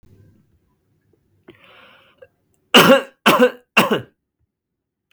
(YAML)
three_cough_length: 5.1 s
three_cough_amplitude: 32768
three_cough_signal_mean_std_ratio: 0.3
survey_phase: beta (2021-08-13 to 2022-03-07)
age: 18-44
gender: Male
wearing_mask: 'No'
symptom_cough_any: true
symptom_sore_throat: true
symptom_headache: true
smoker_status: Never smoked
respiratory_condition_asthma: false
respiratory_condition_other: false
recruitment_source: REACT
submission_delay: 1 day
covid_test_result: Negative
covid_test_method: RT-qPCR
influenza_a_test_result: Negative
influenza_b_test_result: Negative